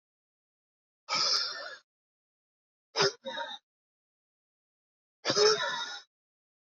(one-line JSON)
{"exhalation_length": "6.7 s", "exhalation_amplitude": 8225, "exhalation_signal_mean_std_ratio": 0.36, "survey_phase": "beta (2021-08-13 to 2022-03-07)", "age": "45-64", "gender": "Male", "wearing_mask": "No", "symptom_cough_any": true, "symptom_runny_or_blocked_nose": true, "symptom_fatigue": true, "symptom_headache": true, "symptom_change_to_sense_of_smell_or_taste": true, "symptom_loss_of_taste": true, "symptom_onset": "8 days", "smoker_status": "Never smoked", "respiratory_condition_asthma": false, "respiratory_condition_other": false, "recruitment_source": "Test and Trace", "submission_delay": "2 days", "covid_test_result": "Positive", "covid_test_method": "RT-qPCR", "covid_ct_value": 16.7, "covid_ct_gene": "ORF1ab gene", "covid_ct_mean": 18.0, "covid_viral_load": "1200000 copies/ml", "covid_viral_load_category": "High viral load (>1M copies/ml)"}